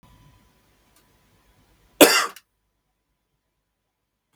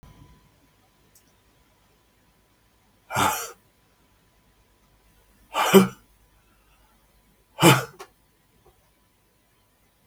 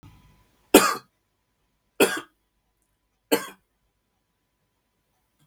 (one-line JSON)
{"cough_length": "4.4 s", "cough_amplitude": 32768, "cough_signal_mean_std_ratio": 0.17, "exhalation_length": "10.1 s", "exhalation_amplitude": 32183, "exhalation_signal_mean_std_ratio": 0.21, "three_cough_length": "5.5 s", "three_cough_amplitude": 32768, "three_cough_signal_mean_std_ratio": 0.2, "survey_phase": "beta (2021-08-13 to 2022-03-07)", "age": "65+", "gender": "Male", "wearing_mask": "No", "symptom_none": true, "smoker_status": "Never smoked", "respiratory_condition_asthma": true, "respiratory_condition_other": false, "recruitment_source": "REACT", "submission_delay": "4 days", "covid_test_result": "Negative", "covid_test_method": "RT-qPCR", "influenza_a_test_result": "Negative", "influenza_b_test_result": "Negative"}